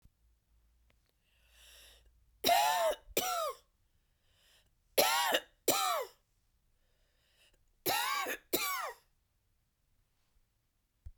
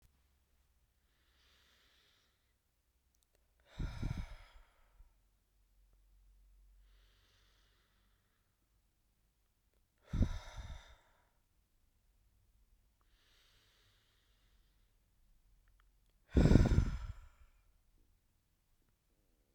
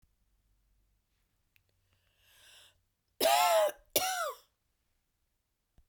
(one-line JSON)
{"three_cough_length": "11.2 s", "three_cough_amplitude": 7706, "three_cough_signal_mean_std_ratio": 0.39, "exhalation_length": "19.5 s", "exhalation_amplitude": 8667, "exhalation_signal_mean_std_ratio": 0.2, "cough_length": "5.9 s", "cough_amplitude": 7777, "cough_signal_mean_std_ratio": 0.31, "survey_phase": "beta (2021-08-13 to 2022-03-07)", "age": "45-64", "gender": "Female", "wearing_mask": "No", "symptom_cough_any": true, "symptom_runny_or_blocked_nose": true, "symptom_sore_throat": true, "symptom_fatigue": true, "symptom_change_to_sense_of_smell_or_taste": true, "symptom_loss_of_taste": true, "symptom_onset": "3 days", "smoker_status": "Never smoked", "respiratory_condition_asthma": false, "respiratory_condition_other": false, "recruitment_source": "Test and Trace", "submission_delay": "2 days", "covid_test_result": "Positive", "covid_test_method": "RT-qPCR", "covid_ct_value": 14.1, "covid_ct_gene": "N gene", "covid_ct_mean": 14.4, "covid_viral_load": "19000000 copies/ml", "covid_viral_load_category": "High viral load (>1M copies/ml)"}